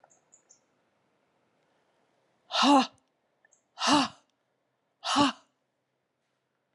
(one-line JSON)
{"exhalation_length": "6.7 s", "exhalation_amplitude": 11318, "exhalation_signal_mean_std_ratio": 0.28, "survey_phase": "beta (2021-08-13 to 2022-03-07)", "age": "65+", "gender": "Female", "wearing_mask": "No", "symptom_none": true, "symptom_onset": "12 days", "smoker_status": "Ex-smoker", "respiratory_condition_asthma": false, "respiratory_condition_other": false, "recruitment_source": "REACT", "submission_delay": "1 day", "covid_test_result": "Negative", "covid_test_method": "RT-qPCR"}